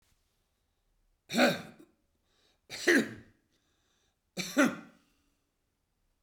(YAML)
three_cough_length: 6.2 s
three_cough_amplitude: 7692
three_cough_signal_mean_std_ratio: 0.28
survey_phase: beta (2021-08-13 to 2022-03-07)
age: 65+
gender: Male
wearing_mask: 'No'
symptom_none: true
smoker_status: Never smoked
respiratory_condition_asthma: false
respiratory_condition_other: false
recruitment_source: REACT
submission_delay: 1 day
covid_test_result: Negative
covid_test_method: RT-qPCR